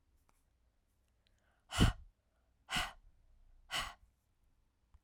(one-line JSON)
{"exhalation_length": "5.0 s", "exhalation_amplitude": 5530, "exhalation_signal_mean_std_ratio": 0.25, "survey_phase": "alpha (2021-03-01 to 2021-08-12)", "age": "45-64", "gender": "Female", "wearing_mask": "No", "symptom_cough_any": true, "symptom_fatigue": true, "symptom_headache": true, "symptom_change_to_sense_of_smell_or_taste": true, "symptom_onset": "7 days", "smoker_status": "Never smoked", "respiratory_condition_asthma": false, "respiratory_condition_other": false, "recruitment_source": "Test and Trace", "submission_delay": "2 days", "covid_test_result": "Positive", "covid_test_method": "RT-qPCR", "covid_ct_value": 19.3, "covid_ct_gene": "ORF1ab gene", "covid_ct_mean": 20.2, "covid_viral_load": "240000 copies/ml", "covid_viral_load_category": "Low viral load (10K-1M copies/ml)"}